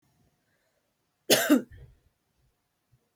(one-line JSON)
{"cough_length": "3.2 s", "cough_amplitude": 15369, "cough_signal_mean_std_ratio": 0.24, "survey_phase": "beta (2021-08-13 to 2022-03-07)", "age": "18-44", "gender": "Female", "wearing_mask": "No", "symptom_runny_or_blocked_nose": true, "symptom_fatigue": true, "symptom_onset": "10 days", "smoker_status": "Never smoked", "respiratory_condition_asthma": false, "respiratory_condition_other": false, "recruitment_source": "REACT", "submission_delay": "1 day", "covid_test_result": "Negative", "covid_test_method": "RT-qPCR"}